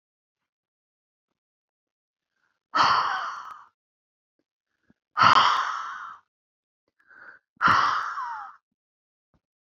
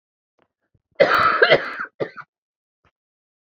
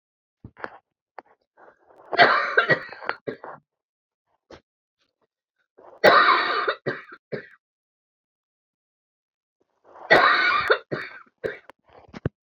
{"exhalation_length": "9.6 s", "exhalation_amplitude": 22492, "exhalation_signal_mean_std_ratio": 0.35, "cough_length": "3.5 s", "cough_amplitude": 30012, "cough_signal_mean_std_ratio": 0.35, "three_cough_length": "12.5 s", "three_cough_amplitude": 27260, "three_cough_signal_mean_std_ratio": 0.33, "survey_phase": "beta (2021-08-13 to 2022-03-07)", "age": "45-64", "gender": "Female", "wearing_mask": "No", "symptom_cough_any": true, "symptom_runny_or_blocked_nose": true, "smoker_status": "Never smoked", "respiratory_condition_asthma": false, "respiratory_condition_other": true, "recruitment_source": "REACT", "submission_delay": "3 days", "covid_test_result": "Negative", "covid_test_method": "RT-qPCR"}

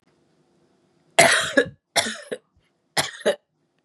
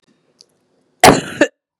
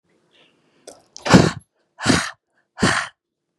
{"three_cough_length": "3.8 s", "three_cough_amplitude": 31627, "three_cough_signal_mean_std_ratio": 0.34, "cough_length": "1.8 s", "cough_amplitude": 32768, "cough_signal_mean_std_ratio": 0.29, "exhalation_length": "3.6 s", "exhalation_amplitude": 32768, "exhalation_signal_mean_std_ratio": 0.32, "survey_phase": "beta (2021-08-13 to 2022-03-07)", "age": "18-44", "gender": "Female", "wearing_mask": "No", "symptom_none": true, "smoker_status": "Never smoked", "respiratory_condition_asthma": false, "respiratory_condition_other": false, "recruitment_source": "REACT", "submission_delay": "2 days", "covid_test_result": "Negative", "covid_test_method": "RT-qPCR", "influenza_a_test_result": "Negative", "influenza_b_test_result": "Negative"}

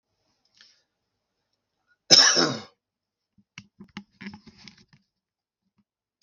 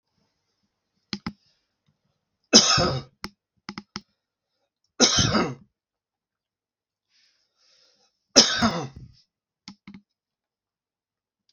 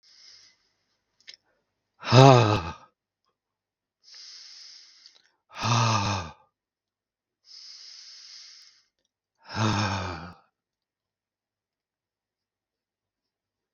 {"cough_length": "6.2 s", "cough_amplitude": 32766, "cough_signal_mean_std_ratio": 0.21, "three_cough_length": "11.5 s", "three_cough_amplitude": 32768, "three_cough_signal_mean_std_ratio": 0.26, "exhalation_length": "13.7 s", "exhalation_amplitude": 32768, "exhalation_signal_mean_std_ratio": 0.25, "survey_phase": "beta (2021-08-13 to 2022-03-07)", "age": "45-64", "gender": "Male", "wearing_mask": "No", "symptom_none": true, "smoker_status": "Ex-smoker", "respiratory_condition_asthma": false, "respiratory_condition_other": true, "recruitment_source": "REACT", "submission_delay": "1 day", "covid_test_result": "Negative", "covid_test_method": "RT-qPCR", "influenza_a_test_result": "Negative", "influenza_b_test_result": "Negative"}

